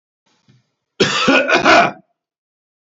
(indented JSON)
{
  "cough_length": "2.9 s",
  "cough_amplitude": 29265,
  "cough_signal_mean_std_ratio": 0.45,
  "survey_phase": "beta (2021-08-13 to 2022-03-07)",
  "age": "65+",
  "gender": "Male",
  "wearing_mask": "No",
  "symptom_none": true,
  "smoker_status": "Ex-smoker",
  "respiratory_condition_asthma": true,
  "respiratory_condition_other": false,
  "recruitment_source": "REACT",
  "submission_delay": "3 days",
  "covid_test_result": "Negative",
  "covid_test_method": "RT-qPCR"
}